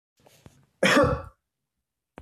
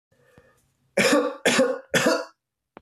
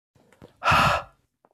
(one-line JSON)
{"cough_length": "2.2 s", "cough_amplitude": 13891, "cough_signal_mean_std_ratio": 0.34, "three_cough_length": "2.8 s", "three_cough_amplitude": 16427, "three_cough_signal_mean_std_ratio": 0.5, "exhalation_length": "1.5 s", "exhalation_amplitude": 13499, "exhalation_signal_mean_std_ratio": 0.42, "survey_phase": "alpha (2021-03-01 to 2021-08-12)", "age": "18-44", "gender": "Male", "wearing_mask": "No", "symptom_cough_any": true, "symptom_fatigue": true, "symptom_change_to_sense_of_smell_or_taste": true, "symptom_onset": "6 days", "smoker_status": "Never smoked", "respiratory_condition_asthma": true, "respiratory_condition_other": false, "recruitment_source": "Test and Trace", "submission_delay": "2 days", "covid_test_result": "Positive", "covid_test_method": "ePCR"}